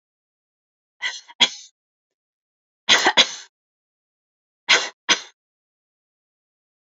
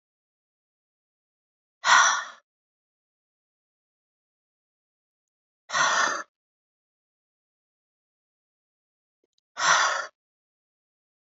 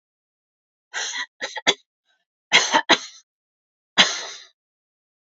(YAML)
three_cough_length: 6.8 s
three_cough_amplitude: 32043
three_cough_signal_mean_std_ratio: 0.25
exhalation_length: 11.3 s
exhalation_amplitude: 18541
exhalation_signal_mean_std_ratio: 0.26
cough_length: 5.4 s
cough_amplitude: 28524
cough_signal_mean_std_ratio: 0.29
survey_phase: beta (2021-08-13 to 2022-03-07)
age: 65+
gender: Female
wearing_mask: 'No'
symptom_none: true
smoker_status: Never smoked
respiratory_condition_asthma: false
respiratory_condition_other: false
recruitment_source: REACT
submission_delay: 1 day
covid_test_result: Negative
covid_test_method: RT-qPCR
influenza_a_test_result: Negative
influenza_b_test_result: Negative